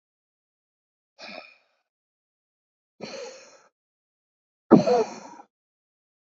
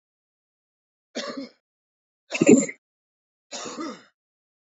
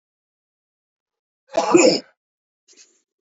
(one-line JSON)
{"exhalation_length": "6.4 s", "exhalation_amplitude": 27777, "exhalation_signal_mean_std_ratio": 0.19, "three_cough_length": "4.7 s", "three_cough_amplitude": 27110, "three_cough_signal_mean_std_ratio": 0.23, "cough_length": "3.2 s", "cough_amplitude": 27197, "cough_signal_mean_std_ratio": 0.27, "survey_phase": "alpha (2021-03-01 to 2021-08-12)", "age": "18-44", "gender": "Male", "wearing_mask": "No", "symptom_cough_any": true, "symptom_new_continuous_cough": true, "symptom_diarrhoea": true, "symptom_fatigue": true, "symptom_fever_high_temperature": true, "symptom_headache": true, "symptom_onset": "6 days", "smoker_status": "Current smoker (e-cigarettes or vapes only)", "respiratory_condition_asthma": false, "respiratory_condition_other": false, "recruitment_source": "Test and Trace", "submission_delay": "2 days", "covid_test_result": "Positive", "covid_test_method": "RT-qPCR", "covid_ct_value": 15.8, "covid_ct_gene": "ORF1ab gene", "covid_ct_mean": 16.0, "covid_viral_load": "5800000 copies/ml", "covid_viral_load_category": "High viral load (>1M copies/ml)"}